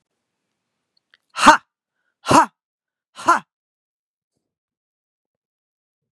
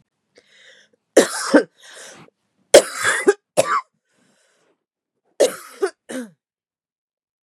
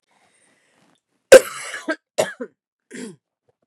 {"exhalation_length": "6.1 s", "exhalation_amplitude": 32768, "exhalation_signal_mean_std_ratio": 0.2, "three_cough_length": "7.4 s", "three_cough_amplitude": 32768, "three_cough_signal_mean_std_ratio": 0.28, "cough_length": "3.7 s", "cough_amplitude": 32768, "cough_signal_mean_std_ratio": 0.19, "survey_phase": "beta (2021-08-13 to 2022-03-07)", "age": "45-64", "gender": "Female", "wearing_mask": "No", "symptom_cough_any": true, "symptom_new_continuous_cough": true, "symptom_runny_or_blocked_nose": true, "symptom_sore_throat": true, "symptom_abdominal_pain": true, "symptom_fatigue": true, "symptom_headache": true, "smoker_status": "Never smoked", "respiratory_condition_asthma": false, "respiratory_condition_other": false, "recruitment_source": "Test and Trace", "submission_delay": "0 days", "covid_test_result": "Positive", "covid_test_method": "LFT"}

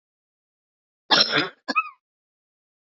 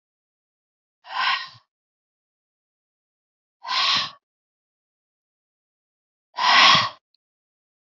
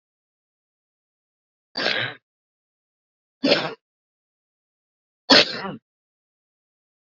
{"cough_length": "2.8 s", "cough_amplitude": 22016, "cough_signal_mean_std_ratio": 0.3, "exhalation_length": "7.9 s", "exhalation_amplitude": 29362, "exhalation_signal_mean_std_ratio": 0.29, "three_cough_length": "7.2 s", "three_cough_amplitude": 29450, "three_cough_signal_mean_std_ratio": 0.23, "survey_phase": "beta (2021-08-13 to 2022-03-07)", "age": "45-64", "gender": "Female", "wearing_mask": "No", "symptom_cough_any": true, "symptom_new_continuous_cough": true, "symptom_runny_or_blocked_nose": true, "symptom_shortness_of_breath": true, "symptom_sore_throat": true, "symptom_headache": true, "symptom_onset": "3 days", "smoker_status": "Never smoked", "respiratory_condition_asthma": true, "respiratory_condition_other": false, "recruitment_source": "Test and Trace", "submission_delay": "2 days", "covid_test_result": "Positive", "covid_test_method": "RT-qPCR", "covid_ct_value": 21.6, "covid_ct_gene": "N gene", "covid_ct_mean": 21.9, "covid_viral_load": "68000 copies/ml", "covid_viral_load_category": "Low viral load (10K-1M copies/ml)"}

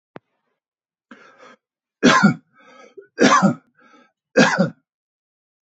{"three_cough_length": "5.7 s", "three_cough_amplitude": 28141, "three_cough_signal_mean_std_ratio": 0.33, "survey_phase": "beta (2021-08-13 to 2022-03-07)", "age": "65+", "gender": "Male", "wearing_mask": "No", "symptom_none": true, "smoker_status": "Ex-smoker", "respiratory_condition_asthma": false, "respiratory_condition_other": false, "recruitment_source": "REACT", "submission_delay": "3 days", "covid_test_result": "Negative", "covid_test_method": "RT-qPCR", "influenza_a_test_result": "Negative", "influenza_b_test_result": "Negative"}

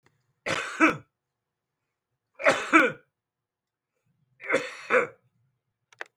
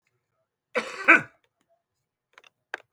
{"three_cough_length": "6.2 s", "three_cough_amplitude": 16407, "three_cough_signal_mean_std_ratio": 0.32, "cough_length": "2.9 s", "cough_amplitude": 24656, "cough_signal_mean_std_ratio": 0.21, "survey_phase": "beta (2021-08-13 to 2022-03-07)", "age": "45-64", "gender": "Male", "wearing_mask": "No", "symptom_none": true, "smoker_status": "Current smoker (11 or more cigarettes per day)", "respiratory_condition_asthma": false, "respiratory_condition_other": false, "recruitment_source": "REACT", "submission_delay": "3 days", "covid_test_result": "Negative", "covid_test_method": "RT-qPCR", "influenza_a_test_result": "Negative", "influenza_b_test_result": "Negative"}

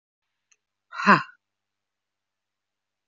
{"exhalation_length": "3.1 s", "exhalation_amplitude": 23508, "exhalation_signal_mean_std_ratio": 0.18, "survey_phase": "beta (2021-08-13 to 2022-03-07)", "age": "18-44", "gender": "Female", "wearing_mask": "No", "symptom_cough_any": true, "symptom_runny_or_blocked_nose": true, "symptom_sore_throat": true, "symptom_fatigue": true, "symptom_fever_high_temperature": true, "symptom_headache": true, "symptom_change_to_sense_of_smell_or_taste": true, "symptom_other": true, "symptom_onset": "3 days", "smoker_status": "Never smoked", "respiratory_condition_asthma": false, "respiratory_condition_other": false, "recruitment_source": "Test and Trace", "submission_delay": "1 day", "covid_test_result": "Positive", "covid_test_method": "RT-qPCR", "covid_ct_value": 22.0, "covid_ct_gene": "ORF1ab gene", "covid_ct_mean": 22.6, "covid_viral_load": "38000 copies/ml", "covid_viral_load_category": "Low viral load (10K-1M copies/ml)"}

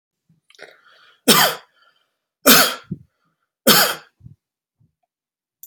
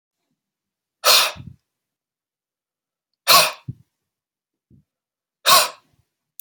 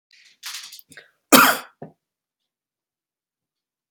{"three_cough_length": "5.7 s", "three_cough_amplitude": 32768, "three_cough_signal_mean_std_ratio": 0.3, "exhalation_length": "6.4 s", "exhalation_amplitude": 32768, "exhalation_signal_mean_std_ratio": 0.26, "cough_length": "3.9 s", "cough_amplitude": 32768, "cough_signal_mean_std_ratio": 0.21, "survey_phase": "beta (2021-08-13 to 2022-03-07)", "age": "45-64", "gender": "Male", "wearing_mask": "No", "symptom_none": true, "smoker_status": "Never smoked", "respiratory_condition_asthma": false, "respiratory_condition_other": false, "recruitment_source": "REACT", "submission_delay": "1 day", "covid_test_result": "Negative", "covid_test_method": "RT-qPCR"}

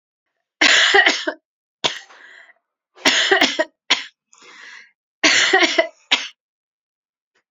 {"three_cough_length": "7.5 s", "three_cough_amplitude": 32768, "three_cough_signal_mean_std_ratio": 0.42, "survey_phase": "alpha (2021-03-01 to 2021-08-12)", "age": "18-44", "gender": "Female", "wearing_mask": "No", "symptom_abdominal_pain": true, "symptom_fatigue": true, "smoker_status": "Never smoked", "respiratory_condition_asthma": false, "respiratory_condition_other": false, "recruitment_source": "REACT", "submission_delay": "2 days", "covid_test_result": "Negative", "covid_test_method": "RT-qPCR"}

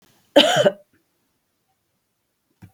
{"cough_length": "2.7 s", "cough_amplitude": 27985, "cough_signal_mean_std_ratio": 0.27, "survey_phase": "beta (2021-08-13 to 2022-03-07)", "age": "45-64", "gender": "Female", "wearing_mask": "No", "symptom_none": true, "smoker_status": "Never smoked", "respiratory_condition_asthma": false, "respiratory_condition_other": false, "recruitment_source": "REACT", "submission_delay": "2 days", "covid_test_result": "Negative", "covid_test_method": "RT-qPCR"}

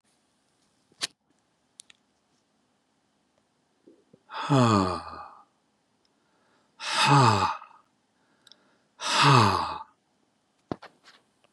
{"exhalation_length": "11.5 s", "exhalation_amplitude": 17347, "exhalation_signal_mean_std_ratio": 0.33, "survey_phase": "beta (2021-08-13 to 2022-03-07)", "age": "65+", "gender": "Male", "wearing_mask": "No", "symptom_none": true, "smoker_status": "Never smoked", "respiratory_condition_asthma": false, "respiratory_condition_other": false, "recruitment_source": "REACT", "submission_delay": "2 days", "covid_test_result": "Negative", "covid_test_method": "RT-qPCR", "influenza_a_test_result": "Negative", "influenza_b_test_result": "Negative"}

